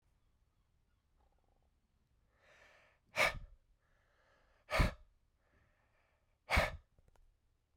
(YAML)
exhalation_length: 7.8 s
exhalation_amplitude: 4014
exhalation_signal_mean_std_ratio: 0.24
survey_phase: alpha (2021-03-01 to 2021-08-12)
age: 18-44
gender: Male
wearing_mask: 'No'
symptom_cough_any: true
symptom_headache: true
smoker_status: Never smoked
respiratory_condition_asthma: false
respiratory_condition_other: false
recruitment_source: Test and Trace
submission_delay: 2 days
covid_test_result: Positive
covid_test_method: RT-qPCR
covid_ct_value: 12.7
covid_ct_gene: N gene
covid_ct_mean: 13.5
covid_viral_load: 36000000 copies/ml
covid_viral_load_category: High viral load (>1M copies/ml)